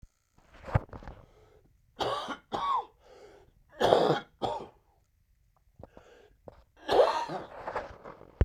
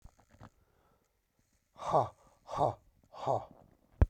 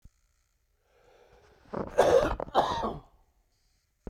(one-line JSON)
{"three_cough_length": "8.4 s", "three_cough_amplitude": 20206, "three_cough_signal_mean_std_ratio": 0.38, "exhalation_length": "4.1 s", "exhalation_amplitude": 8171, "exhalation_signal_mean_std_ratio": 0.29, "cough_length": "4.1 s", "cough_amplitude": 11416, "cough_signal_mean_std_ratio": 0.36, "survey_phase": "beta (2021-08-13 to 2022-03-07)", "age": "45-64", "gender": "Male", "wearing_mask": "No", "symptom_cough_any": true, "symptom_new_continuous_cough": true, "symptom_runny_or_blocked_nose": true, "symptom_sore_throat": true, "symptom_fatigue": true, "symptom_headache": true, "symptom_onset": "3 days", "smoker_status": "Ex-smoker", "respiratory_condition_asthma": false, "respiratory_condition_other": false, "recruitment_source": "Test and Trace", "submission_delay": "1 day", "covid_test_result": "Positive", "covid_test_method": "ePCR"}